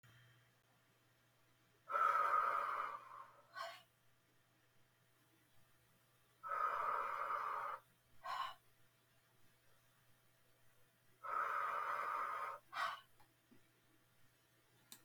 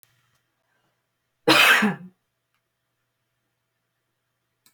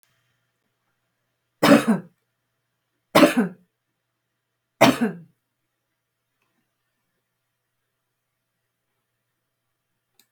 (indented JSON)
{
  "exhalation_length": "15.0 s",
  "exhalation_amplitude": 1831,
  "exhalation_signal_mean_std_ratio": 0.48,
  "cough_length": "4.7 s",
  "cough_amplitude": 22884,
  "cough_signal_mean_std_ratio": 0.25,
  "three_cough_length": "10.3 s",
  "three_cough_amplitude": 31736,
  "three_cough_signal_mean_std_ratio": 0.22,
  "survey_phase": "beta (2021-08-13 to 2022-03-07)",
  "age": "45-64",
  "gender": "Female",
  "wearing_mask": "No",
  "symptom_none": true,
  "symptom_onset": "13 days",
  "smoker_status": "Never smoked",
  "respiratory_condition_asthma": false,
  "respiratory_condition_other": false,
  "recruitment_source": "REACT",
  "submission_delay": "2 days",
  "covid_test_result": "Negative",
  "covid_test_method": "RT-qPCR"
}